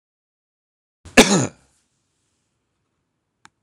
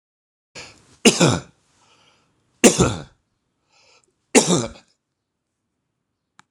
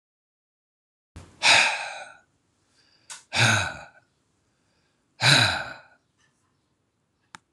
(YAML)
cough_length: 3.6 s
cough_amplitude: 26028
cough_signal_mean_std_ratio: 0.19
three_cough_length: 6.5 s
three_cough_amplitude: 26028
three_cough_signal_mean_std_ratio: 0.27
exhalation_length: 7.5 s
exhalation_amplitude: 25281
exhalation_signal_mean_std_ratio: 0.32
survey_phase: alpha (2021-03-01 to 2021-08-12)
age: 65+
gender: Male
wearing_mask: 'No'
symptom_none: true
smoker_status: Ex-smoker
respiratory_condition_asthma: false
respiratory_condition_other: false
recruitment_source: REACT
submission_delay: 3 days
covid_test_result: Negative
covid_test_method: RT-qPCR